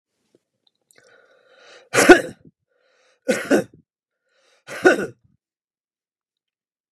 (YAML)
exhalation_length: 6.9 s
exhalation_amplitude: 32768
exhalation_signal_mean_std_ratio: 0.23
survey_phase: beta (2021-08-13 to 2022-03-07)
age: 45-64
gender: Male
wearing_mask: 'No'
symptom_runny_or_blocked_nose: true
smoker_status: Ex-smoker
respiratory_condition_asthma: false
respiratory_condition_other: false
recruitment_source: REACT
submission_delay: 2 days
covid_test_result: Negative
covid_test_method: RT-qPCR
influenza_a_test_result: Negative
influenza_b_test_result: Negative